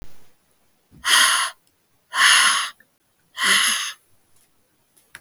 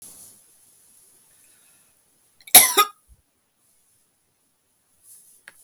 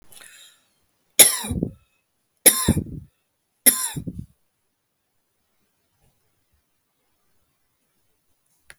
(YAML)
exhalation_length: 5.2 s
exhalation_amplitude: 27573
exhalation_signal_mean_std_ratio: 0.45
cough_length: 5.6 s
cough_amplitude: 32768
cough_signal_mean_std_ratio: 0.17
three_cough_length: 8.8 s
three_cough_amplitude: 32768
three_cough_signal_mean_std_ratio: 0.22
survey_phase: beta (2021-08-13 to 2022-03-07)
age: 45-64
gender: Female
wearing_mask: 'No'
symptom_none: true
smoker_status: Never smoked
respiratory_condition_asthma: false
respiratory_condition_other: false
recruitment_source: REACT
submission_delay: 1 day
covid_test_result: Negative
covid_test_method: RT-qPCR
influenza_a_test_result: Negative
influenza_b_test_result: Negative